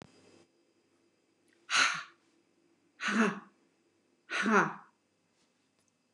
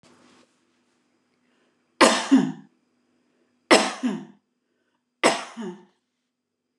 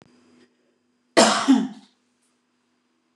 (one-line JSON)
{"exhalation_length": "6.1 s", "exhalation_amplitude": 9598, "exhalation_signal_mean_std_ratio": 0.33, "three_cough_length": "6.8 s", "three_cough_amplitude": 29203, "three_cough_signal_mean_std_ratio": 0.28, "cough_length": "3.2 s", "cough_amplitude": 28336, "cough_signal_mean_std_ratio": 0.3, "survey_phase": "beta (2021-08-13 to 2022-03-07)", "age": "65+", "gender": "Female", "wearing_mask": "No", "symptom_none": true, "smoker_status": "Ex-smoker", "respiratory_condition_asthma": false, "respiratory_condition_other": false, "recruitment_source": "REACT", "submission_delay": "1 day", "covid_test_result": "Negative", "covid_test_method": "RT-qPCR", "influenza_a_test_result": "Negative", "influenza_b_test_result": "Negative"}